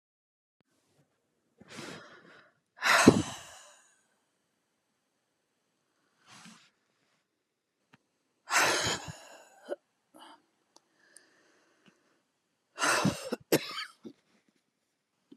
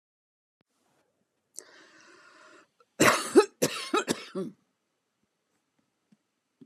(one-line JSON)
{"exhalation_length": "15.4 s", "exhalation_amplitude": 23300, "exhalation_signal_mean_std_ratio": 0.25, "cough_length": "6.7 s", "cough_amplitude": 17703, "cough_signal_mean_std_ratio": 0.25, "survey_phase": "beta (2021-08-13 to 2022-03-07)", "age": "65+", "gender": "Female", "wearing_mask": "No", "symptom_cough_any": true, "symptom_runny_or_blocked_nose": true, "symptom_diarrhoea": true, "symptom_fatigue": true, "symptom_onset": "12 days", "smoker_status": "Ex-smoker", "respiratory_condition_asthma": false, "respiratory_condition_other": false, "recruitment_source": "REACT", "submission_delay": "2 days", "covid_test_result": "Negative", "covid_test_method": "RT-qPCR"}